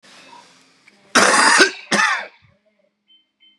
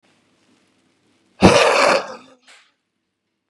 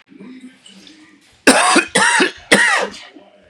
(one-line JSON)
{"cough_length": "3.6 s", "cough_amplitude": 32767, "cough_signal_mean_std_ratio": 0.41, "exhalation_length": "3.5 s", "exhalation_amplitude": 32768, "exhalation_signal_mean_std_ratio": 0.34, "three_cough_length": "3.5 s", "three_cough_amplitude": 32768, "three_cough_signal_mean_std_ratio": 0.5, "survey_phase": "beta (2021-08-13 to 2022-03-07)", "age": "18-44", "gender": "Male", "wearing_mask": "No", "symptom_cough_any": true, "symptom_shortness_of_breath": true, "symptom_abdominal_pain": true, "symptom_fatigue": true, "symptom_onset": "4 days", "smoker_status": "Current smoker (11 or more cigarettes per day)", "respiratory_condition_asthma": false, "respiratory_condition_other": false, "recruitment_source": "REACT", "submission_delay": "2 days", "covid_test_result": "Negative", "covid_test_method": "RT-qPCR", "influenza_a_test_result": "Negative", "influenza_b_test_result": "Negative"}